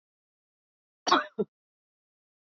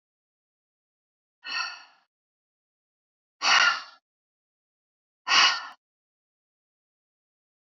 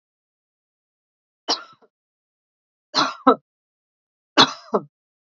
{"cough_length": "2.5 s", "cough_amplitude": 11375, "cough_signal_mean_std_ratio": 0.21, "exhalation_length": "7.7 s", "exhalation_amplitude": 16592, "exhalation_signal_mean_std_ratio": 0.26, "three_cough_length": "5.4 s", "three_cough_amplitude": 29641, "three_cough_signal_mean_std_ratio": 0.22, "survey_phase": "beta (2021-08-13 to 2022-03-07)", "age": "45-64", "gender": "Female", "wearing_mask": "No", "symptom_none": true, "symptom_onset": "3 days", "smoker_status": "Never smoked", "respiratory_condition_asthma": false, "respiratory_condition_other": false, "recruitment_source": "REACT", "submission_delay": "0 days", "covid_test_result": "Negative", "covid_test_method": "RT-qPCR"}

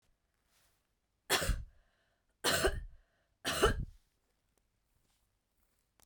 {"three_cough_length": "6.1 s", "three_cough_amplitude": 5753, "three_cough_signal_mean_std_ratio": 0.33, "survey_phase": "beta (2021-08-13 to 2022-03-07)", "age": "18-44", "gender": "Female", "wearing_mask": "No", "symptom_cough_any": true, "symptom_runny_or_blocked_nose": true, "symptom_headache": true, "symptom_change_to_sense_of_smell_or_taste": true, "symptom_loss_of_taste": true, "symptom_onset": "12 days", "smoker_status": "Never smoked", "respiratory_condition_asthma": false, "respiratory_condition_other": false, "recruitment_source": "REACT", "submission_delay": "1 day", "covid_test_result": "Negative", "covid_test_method": "RT-qPCR", "influenza_a_test_result": "Negative", "influenza_b_test_result": "Negative"}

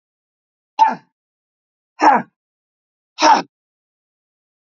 {"exhalation_length": "4.8 s", "exhalation_amplitude": 28822, "exhalation_signal_mean_std_ratio": 0.27, "survey_phase": "alpha (2021-03-01 to 2021-08-12)", "age": "45-64", "gender": "Female", "wearing_mask": "No", "symptom_none": true, "smoker_status": "Never smoked", "respiratory_condition_asthma": false, "respiratory_condition_other": false, "recruitment_source": "REACT", "submission_delay": "1 day", "covid_test_result": "Negative", "covid_test_method": "RT-qPCR"}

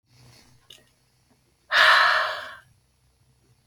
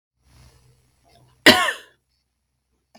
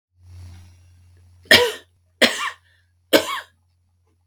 {"exhalation_length": "3.7 s", "exhalation_amplitude": 23772, "exhalation_signal_mean_std_ratio": 0.35, "cough_length": "3.0 s", "cough_amplitude": 32768, "cough_signal_mean_std_ratio": 0.21, "three_cough_length": "4.3 s", "three_cough_amplitude": 32766, "three_cough_signal_mean_std_ratio": 0.29, "survey_phase": "beta (2021-08-13 to 2022-03-07)", "age": "45-64", "gender": "Female", "wearing_mask": "No", "symptom_none": true, "smoker_status": "Ex-smoker", "respiratory_condition_asthma": false, "respiratory_condition_other": false, "recruitment_source": "REACT", "submission_delay": "1 day", "covid_test_result": "Negative", "covid_test_method": "RT-qPCR", "influenza_a_test_result": "Negative", "influenza_b_test_result": "Negative"}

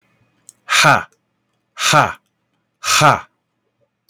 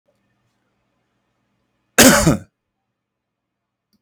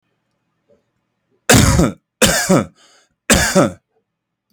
{"exhalation_length": "4.1 s", "exhalation_amplitude": 32767, "exhalation_signal_mean_std_ratio": 0.38, "cough_length": "4.0 s", "cough_amplitude": 32768, "cough_signal_mean_std_ratio": 0.24, "three_cough_length": "4.5 s", "three_cough_amplitude": 32768, "three_cough_signal_mean_std_ratio": 0.42, "survey_phase": "alpha (2021-03-01 to 2021-08-12)", "age": "18-44", "gender": "Male", "wearing_mask": "No", "symptom_none": true, "smoker_status": "Never smoked", "respiratory_condition_asthma": false, "respiratory_condition_other": false, "recruitment_source": "REACT", "submission_delay": "30 days", "covid_test_result": "Negative", "covid_test_method": "RT-qPCR"}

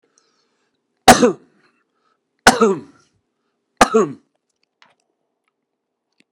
{"three_cough_length": "6.3 s", "three_cough_amplitude": 32768, "three_cough_signal_mean_std_ratio": 0.25, "survey_phase": "beta (2021-08-13 to 2022-03-07)", "age": "65+", "gender": "Male", "wearing_mask": "No", "symptom_cough_any": true, "symptom_runny_or_blocked_nose": true, "symptom_shortness_of_breath": true, "symptom_fatigue": true, "symptom_change_to_sense_of_smell_or_taste": true, "smoker_status": "Ex-smoker", "respiratory_condition_asthma": false, "respiratory_condition_other": false, "recruitment_source": "REACT", "submission_delay": "5 days", "covid_test_result": "Negative", "covid_test_method": "RT-qPCR"}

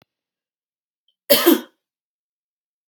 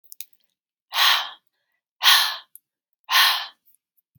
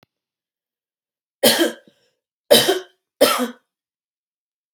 {"cough_length": "2.9 s", "cough_amplitude": 32767, "cough_signal_mean_std_ratio": 0.23, "exhalation_length": "4.2 s", "exhalation_amplitude": 27050, "exhalation_signal_mean_std_ratio": 0.38, "three_cough_length": "4.7 s", "three_cough_amplitude": 32768, "three_cough_signal_mean_std_ratio": 0.31, "survey_phase": "beta (2021-08-13 to 2022-03-07)", "age": "18-44", "gender": "Female", "wearing_mask": "No", "symptom_fatigue": true, "symptom_onset": "12 days", "smoker_status": "Never smoked", "respiratory_condition_asthma": false, "respiratory_condition_other": false, "recruitment_source": "REACT", "submission_delay": "2 days", "covid_test_result": "Negative", "covid_test_method": "RT-qPCR", "influenza_a_test_result": "Negative", "influenza_b_test_result": "Negative"}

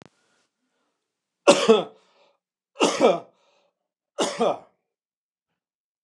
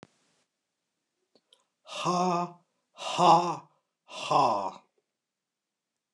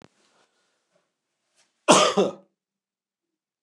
{"three_cough_length": "6.0 s", "three_cough_amplitude": 28383, "three_cough_signal_mean_std_ratio": 0.29, "exhalation_length": "6.1 s", "exhalation_amplitude": 13922, "exhalation_signal_mean_std_ratio": 0.37, "cough_length": "3.6 s", "cough_amplitude": 28991, "cough_signal_mean_std_ratio": 0.25, "survey_phase": "beta (2021-08-13 to 2022-03-07)", "age": "45-64", "gender": "Male", "wearing_mask": "No", "symptom_none": true, "smoker_status": "Ex-smoker", "respiratory_condition_asthma": false, "respiratory_condition_other": false, "recruitment_source": "REACT", "submission_delay": "0 days", "covid_test_result": "Negative", "covid_test_method": "RT-qPCR"}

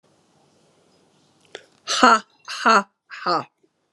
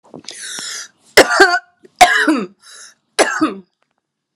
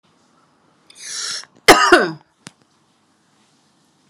{"exhalation_length": "3.9 s", "exhalation_amplitude": 32767, "exhalation_signal_mean_std_ratio": 0.32, "three_cough_length": "4.4 s", "three_cough_amplitude": 32768, "three_cough_signal_mean_std_ratio": 0.41, "cough_length": "4.1 s", "cough_amplitude": 32768, "cough_signal_mean_std_ratio": 0.27, "survey_phase": "alpha (2021-03-01 to 2021-08-12)", "age": "45-64", "gender": "Female", "wearing_mask": "No", "symptom_none": true, "smoker_status": "Ex-smoker", "respiratory_condition_asthma": true, "respiratory_condition_other": false, "recruitment_source": "REACT", "submission_delay": "3 days", "covid_test_result": "Negative", "covid_test_method": "RT-qPCR"}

